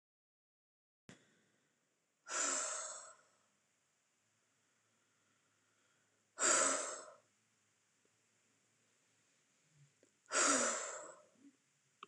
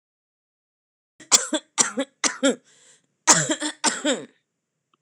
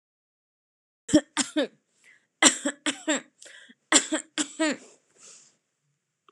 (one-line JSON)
{"exhalation_length": "12.1 s", "exhalation_amplitude": 4145, "exhalation_signal_mean_std_ratio": 0.31, "cough_length": "5.0 s", "cough_amplitude": 26028, "cough_signal_mean_std_ratio": 0.35, "three_cough_length": "6.3 s", "three_cough_amplitude": 25203, "three_cough_signal_mean_std_ratio": 0.31, "survey_phase": "alpha (2021-03-01 to 2021-08-12)", "age": "45-64", "gender": "Female", "wearing_mask": "No", "symptom_none": true, "smoker_status": "Never smoked", "respiratory_condition_asthma": false, "respiratory_condition_other": false, "recruitment_source": "REACT", "submission_delay": "1 day", "covid_test_result": "Negative", "covid_test_method": "RT-qPCR"}